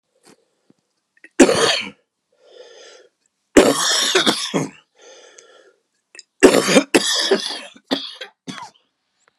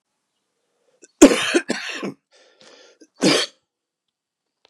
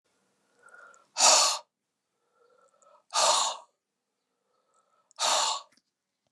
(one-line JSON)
{"three_cough_length": "9.4 s", "three_cough_amplitude": 32768, "three_cough_signal_mean_std_ratio": 0.38, "cough_length": "4.7 s", "cough_amplitude": 32768, "cough_signal_mean_std_ratio": 0.27, "exhalation_length": "6.3 s", "exhalation_amplitude": 14743, "exhalation_signal_mean_std_ratio": 0.34, "survey_phase": "beta (2021-08-13 to 2022-03-07)", "age": "65+", "gender": "Male", "wearing_mask": "No", "symptom_cough_any": true, "symptom_runny_or_blocked_nose": true, "symptom_sore_throat": true, "symptom_onset": "5 days", "smoker_status": "Ex-smoker", "respiratory_condition_asthma": true, "respiratory_condition_other": true, "recruitment_source": "REACT", "submission_delay": "1 day", "covid_test_result": "Positive", "covid_test_method": "RT-qPCR", "covid_ct_value": 22.4, "covid_ct_gene": "E gene", "influenza_a_test_result": "Negative", "influenza_b_test_result": "Negative"}